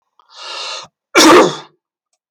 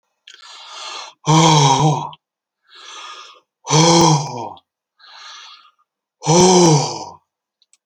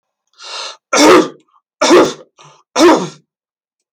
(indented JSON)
{
  "cough_length": "2.3 s",
  "cough_amplitude": 32768,
  "cough_signal_mean_std_ratio": 0.41,
  "exhalation_length": "7.9 s",
  "exhalation_amplitude": 32768,
  "exhalation_signal_mean_std_ratio": 0.47,
  "three_cough_length": "3.9 s",
  "three_cough_amplitude": 32767,
  "three_cough_signal_mean_std_ratio": 0.45,
  "survey_phase": "beta (2021-08-13 to 2022-03-07)",
  "age": "45-64",
  "gender": "Male",
  "wearing_mask": "No",
  "symptom_none": true,
  "smoker_status": "Ex-smoker",
  "respiratory_condition_asthma": false,
  "respiratory_condition_other": false,
  "recruitment_source": "REACT",
  "submission_delay": "1 day",
  "covid_test_result": "Negative",
  "covid_test_method": "RT-qPCR"
}